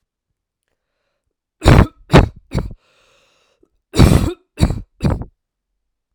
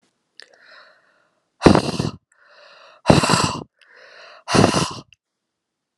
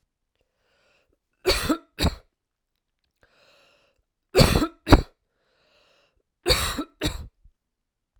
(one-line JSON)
{"cough_length": "6.1 s", "cough_amplitude": 32768, "cough_signal_mean_std_ratio": 0.31, "exhalation_length": "6.0 s", "exhalation_amplitude": 32768, "exhalation_signal_mean_std_ratio": 0.33, "three_cough_length": "8.2 s", "three_cough_amplitude": 32768, "three_cough_signal_mean_std_ratio": 0.28, "survey_phase": "alpha (2021-03-01 to 2021-08-12)", "age": "18-44", "gender": "Female", "wearing_mask": "No", "symptom_none": true, "smoker_status": "Ex-smoker", "respiratory_condition_asthma": false, "respiratory_condition_other": false, "recruitment_source": "REACT", "submission_delay": "2 days", "covid_test_result": "Negative", "covid_test_method": "RT-qPCR"}